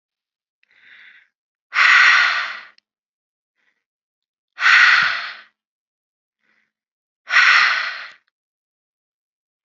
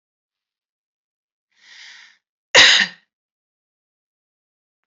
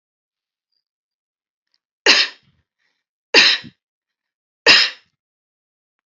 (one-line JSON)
{"exhalation_length": "9.6 s", "exhalation_amplitude": 28806, "exhalation_signal_mean_std_ratio": 0.36, "cough_length": "4.9 s", "cough_amplitude": 31983, "cough_signal_mean_std_ratio": 0.21, "three_cough_length": "6.1 s", "three_cough_amplitude": 30544, "three_cough_signal_mean_std_ratio": 0.26, "survey_phase": "alpha (2021-03-01 to 2021-08-12)", "age": "45-64", "gender": "Female", "wearing_mask": "No", "symptom_none": true, "smoker_status": "Ex-smoker", "respiratory_condition_asthma": false, "respiratory_condition_other": false, "recruitment_source": "REACT", "submission_delay": "1 day", "covid_test_result": "Negative", "covid_test_method": "RT-qPCR"}